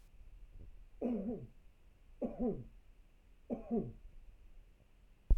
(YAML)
three_cough_length: 5.4 s
three_cough_amplitude: 4620
three_cough_signal_mean_std_ratio: 0.4
survey_phase: beta (2021-08-13 to 2022-03-07)
age: 65+
gender: Male
wearing_mask: 'No'
symptom_none: true
smoker_status: Ex-smoker
respiratory_condition_asthma: false
respiratory_condition_other: false
recruitment_source: REACT
submission_delay: 2 days
covid_test_result: Negative
covid_test_method: RT-qPCR